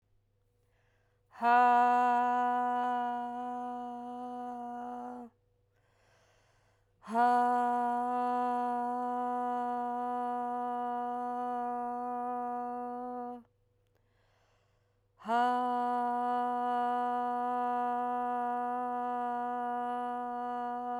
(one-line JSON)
{"exhalation_length": "21.0 s", "exhalation_amplitude": 5685, "exhalation_signal_mean_std_ratio": 0.83, "survey_phase": "alpha (2021-03-01 to 2021-08-12)", "age": "45-64", "gender": "Female", "wearing_mask": "No", "symptom_cough_any": true, "symptom_fatigue": true, "symptom_fever_high_temperature": true, "symptom_headache": true, "symptom_onset": "3 days", "smoker_status": "Never smoked", "respiratory_condition_asthma": false, "respiratory_condition_other": false, "recruitment_source": "Test and Trace", "submission_delay": "1 day", "covid_test_result": "Positive", "covid_test_method": "RT-qPCR", "covid_ct_value": 17.8, "covid_ct_gene": "ORF1ab gene", "covid_ct_mean": 18.4, "covid_viral_load": "940000 copies/ml", "covid_viral_load_category": "Low viral load (10K-1M copies/ml)"}